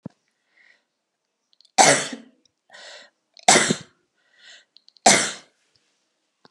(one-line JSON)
{"three_cough_length": "6.5 s", "three_cough_amplitude": 32663, "three_cough_signal_mean_std_ratio": 0.27, "survey_phase": "beta (2021-08-13 to 2022-03-07)", "age": "65+", "gender": "Female", "wearing_mask": "No", "symptom_none": true, "smoker_status": "Never smoked", "respiratory_condition_asthma": false, "respiratory_condition_other": false, "recruitment_source": "REACT", "submission_delay": "1 day", "covid_test_result": "Negative", "covid_test_method": "RT-qPCR"}